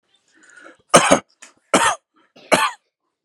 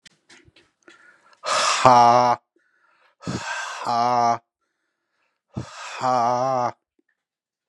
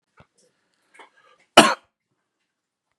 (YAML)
three_cough_length: 3.2 s
three_cough_amplitude: 32768
three_cough_signal_mean_std_ratio: 0.33
exhalation_length: 7.7 s
exhalation_amplitude: 32767
exhalation_signal_mean_std_ratio: 0.44
cough_length: 3.0 s
cough_amplitude: 32768
cough_signal_mean_std_ratio: 0.16
survey_phase: beta (2021-08-13 to 2022-03-07)
age: 18-44
gender: Male
wearing_mask: 'No'
symptom_none: true
smoker_status: Never smoked
respiratory_condition_asthma: false
respiratory_condition_other: true
recruitment_source: REACT
submission_delay: 2 days
covid_test_result: Negative
covid_test_method: RT-qPCR